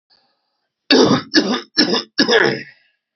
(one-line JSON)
{"cough_length": "3.2 s", "cough_amplitude": 32768, "cough_signal_mean_std_ratio": 0.51, "survey_phase": "beta (2021-08-13 to 2022-03-07)", "age": "45-64", "gender": "Male", "wearing_mask": "No", "symptom_cough_any": true, "symptom_runny_or_blocked_nose": true, "symptom_sore_throat": true, "symptom_headache": true, "symptom_onset": "2 days", "smoker_status": "Ex-smoker", "respiratory_condition_asthma": false, "respiratory_condition_other": false, "recruitment_source": "Test and Trace", "submission_delay": "2 days", "covid_test_result": "Positive", "covid_test_method": "RT-qPCR", "covid_ct_value": 21.7, "covid_ct_gene": "ORF1ab gene", "covid_ct_mean": 22.5, "covid_viral_load": "43000 copies/ml", "covid_viral_load_category": "Low viral load (10K-1M copies/ml)"}